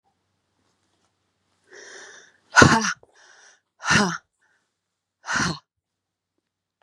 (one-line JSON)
{"exhalation_length": "6.8 s", "exhalation_amplitude": 32768, "exhalation_signal_mean_std_ratio": 0.26, "survey_phase": "beta (2021-08-13 to 2022-03-07)", "age": "45-64", "gender": "Female", "wearing_mask": "No", "symptom_cough_any": true, "symptom_new_continuous_cough": true, "symptom_fatigue": true, "symptom_fever_high_temperature": true, "symptom_headache": true, "symptom_change_to_sense_of_smell_or_taste": true, "symptom_onset": "3 days", "smoker_status": "Never smoked", "respiratory_condition_asthma": false, "respiratory_condition_other": false, "recruitment_source": "Test and Trace", "submission_delay": "1 day", "covid_test_result": "Positive", "covid_test_method": "ePCR"}